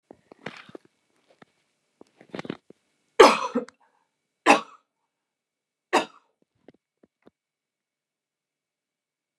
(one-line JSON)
{"three_cough_length": "9.4 s", "three_cough_amplitude": 29204, "three_cough_signal_mean_std_ratio": 0.17, "survey_phase": "beta (2021-08-13 to 2022-03-07)", "age": "45-64", "gender": "Female", "wearing_mask": "No", "symptom_none": true, "smoker_status": "Never smoked", "respiratory_condition_asthma": false, "respiratory_condition_other": false, "recruitment_source": "REACT", "submission_delay": "3 days", "covid_test_result": "Negative", "covid_test_method": "RT-qPCR"}